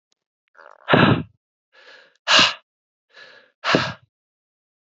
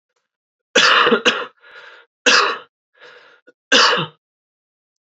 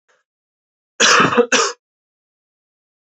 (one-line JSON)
{"exhalation_length": "4.9 s", "exhalation_amplitude": 31707, "exhalation_signal_mean_std_ratio": 0.32, "three_cough_length": "5.0 s", "three_cough_amplitude": 31379, "three_cough_signal_mean_std_ratio": 0.41, "cough_length": "3.2 s", "cough_amplitude": 31749, "cough_signal_mean_std_ratio": 0.36, "survey_phase": "beta (2021-08-13 to 2022-03-07)", "age": "18-44", "gender": "Male", "wearing_mask": "No", "symptom_cough_any": true, "symptom_new_continuous_cough": true, "symptom_runny_or_blocked_nose": true, "symptom_sore_throat": true, "symptom_fatigue": true, "symptom_headache": true, "symptom_change_to_sense_of_smell_or_taste": true, "symptom_loss_of_taste": true, "symptom_onset": "4 days", "smoker_status": "Never smoked", "respiratory_condition_asthma": false, "respiratory_condition_other": false, "recruitment_source": "Test and Trace", "submission_delay": "1 day", "covid_test_result": "Positive", "covid_test_method": "RT-qPCR", "covid_ct_value": 25.0, "covid_ct_gene": "N gene"}